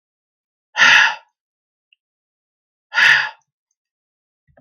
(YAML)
exhalation_length: 4.6 s
exhalation_amplitude: 32768
exhalation_signal_mean_std_ratio: 0.31
survey_phase: beta (2021-08-13 to 2022-03-07)
age: 65+
gender: Male
wearing_mask: 'No'
symptom_none: true
smoker_status: Never smoked
respiratory_condition_asthma: true
respiratory_condition_other: false
recruitment_source: REACT
submission_delay: 1 day
covid_test_result: Negative
covid_test_method: RT-qPCR
influenza_a_test_result: Negative
influenza_b_test_result: Negative